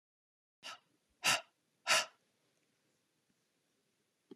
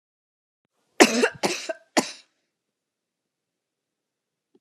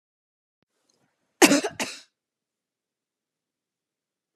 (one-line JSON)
{"exhalation_length": "4.4 s", "exhalation_amplitude": 4889, "exhalation_signal_mean_std_ratio": 0.23, "three_cough_length": "4.6 s", "three_cough_amplitude": 32767, "three_cough_signal_mean_std_ratio": 0.23, "cough_length": "4.4 s", "cough_amplitude": 32767, "cough_signal_mean_std_ratio": 0.18, "survey_phase": "beta (2021-08-13 to 2022-03-07)", "age": "45-64", "gender": "Female", "wearing_mask": "No", "symptom_none": true, "smoker_status": "Never smoked", "respiratory_condition_asthma": false, "respiratory_condition_other": false, "recruitment_source": "REACT", "submission_delay": "2 days", "covid_test_result": "Negative", "covid_test_method": "RT-qPCR"}